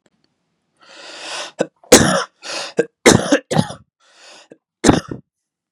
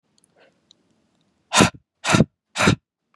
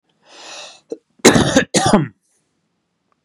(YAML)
three_cough_length: 5.7 s
three_cough_amplitude: 32768
three_cough_signal_mean_std_ratio: 0.34
exhalation_length: 3.2 s
exhalation_amplitude: 32324
exhalation_signal_mean_std_ratio: 0.31
cough_length: 3.2 s
cough_amplitude: 32768
cough_signal_mean_std_ratio: 0.37
survey_phase: beta (2021-08-13 to 2022-03-07)
age: 18-44
gender: Male
wearing_mask: 'No'
symptom_none: true
smoker_status: Never smoked
respiratory_condition_asthma: false
respiratory_condition_other: false
recruitment_source: REACT
submission_delay: 1 day
covid_test_result: Negative
covid_test_method: RT-qPCR
influenza_a_test_result: Negative
influenza_b_test_result: Negative